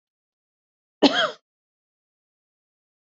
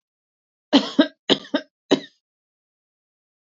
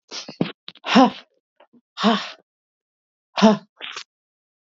{"cough_length": "3.1 s", "cough_amplitude": 26349, "cough_signal_mean_std_ratio": 0.2, "three_cough_length": "3.5 s", "three_cough_amplitude": 25857, "three_cough_signal_mean_std_ratio": 0.25, "exhalation_length": "4.7 s", "exhalation_amplitude": 27258, "exhalation_signal_mean_std_ratio": 0.31, "survey_phase": "beta (2021-08-13 to 2022-03-07)", "age": "45-64", "gender": "Female", "wearing_mask": "No", "symptom_none": true, "smoker_status": "Never smoked", "respiratory_condition_asthma": false, "respiratory_condition_other": false, "recruitment_source": "REACT", "submission_delay": "2 days", "covid_test_result": "Negative", "covid_test_method": "RT-qPCR", "influenza_a_test_result": "Negative", "influenza_b_test_result": "Negative"}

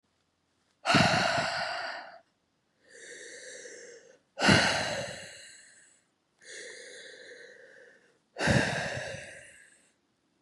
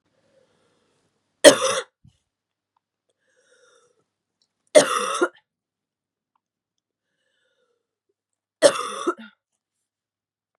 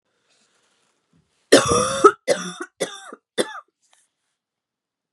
{"exhalation_length": "10.4 s", "exhalation_amplitude": 14255, "exhalation_signal_mean_std_ratio": 0.42, "three_cough_length": "10.6 s", "three_cough_amplitude": 32768, "three_cough_signal_mean_std_ratio": 0.2, "cough_length": "5.1 s", "cough_amplitude": 32108, "cough_signal_mean_std_ratio": 0.29, "survey_phase": "beta (2021-08-13 to 2022-03-07)", "age": "18-44", "gender": "Female", "wearing_mask": "No", "symptom_cough_any": true, "symptom_runny_or_blocked_nose": true, "symptom_fatigue": true, "symptom_fever_high_temperature": true, "symptom_headache": true, "symptom_onset": "4 days", "smoker_status": "Ex-smoker", "respiratory_condition_asthma": false, "respiratory_condition_other": false, "recruitment_source": "Test and Trace", "submission_delay": "2 days", "covid_test_result": "Positive", "covid_test_method": "ePCR"}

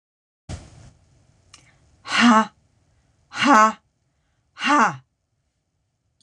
{"exhalation_length": "6.2 s", "exhalation_amplitude": 26028, "exhalation_signal_mean_std_ratio": 0.32, "survey_phase": "beta (2021-08-13 to 2022-03-07)", "age": "65+", "gender": "Female", "wearing_mask": "No", "symptom_none": true, "smoker_status": "Ex-smoker", "respiratory_condition_asthma": false, "respiratory_condition_other": false, "recruitment_source": "REACT", "submission_delay": "3 days", "covid_test_result": "Negative", "covid_test_method": "RT-qPCR"}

